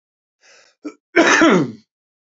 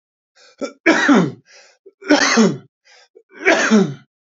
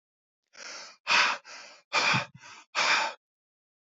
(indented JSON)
{
  "cough_length": "2.2 s",
  "cough_amplitude": 30473,
  "cough_signal_mean_std_ratio": 0.42,
  "three_cough_length": "4.4 s",
  "three_cough_amplitude": 28507,
  "three_cough_signal_mean_std_ratio": 0.48,
  "exhalation_length": "3.8 s",
  "exhalation_amplitude": 10485,
  "exhalation_signal_mean_std_ratio": 0.45,
  "survey_phase": "beta (2021-08-13 to 2022-03-07)",
  "age": "45-64",
  "gender": "Male",
  "wearing_mask": "No",
  "symptom_runny_or_blocked_nose": true,
  "smoker_status": "Ex-smoker",
  "respiratory_condition_asthma": false,
  "respiratory_condition_other": false,
  "recruitment_source": "REACT",
  "submission_delay": "2 days",
  "covid_test_result": "Negative",
  "covid_test_method": "RT-qPCR",
  "influenza_a_test_result": "Negative",
  "influenza_b_test_result": "Negative"
}